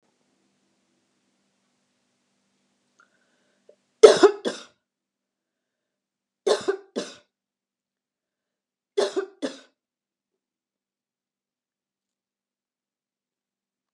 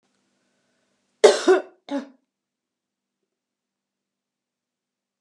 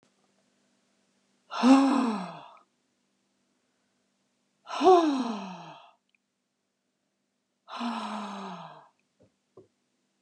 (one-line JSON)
{"three_cough_length": "13.9 s", "three_cough_amplitude": 32768, "three_cough_signal_mean_std_ratio": 0.15, "cough_length": "5.2 s", "cough_amplitude": 31256, "cough_signal_mean_std_ratio": 0.2, "exhalation_length": "10.2 s", "exhalation_amplitude": 15891, "exhalation_signal_mean_std_ratio": 0.31, "survey_phase": "beta (2021-08-13 to 2022-03-07)", "age": "65+", "gender": "Female", "wearing_mask": "No", "symptom_cough_any": true, "smoker_status": "Never smoked", "respiratory_condition_asthma": false, "respiratory_condition_other": false, "recruitment_source": "REACT", "submission_delay": "1 day", "covid_test_result": "Negative", "covid_test_method": "RT-qPCR"}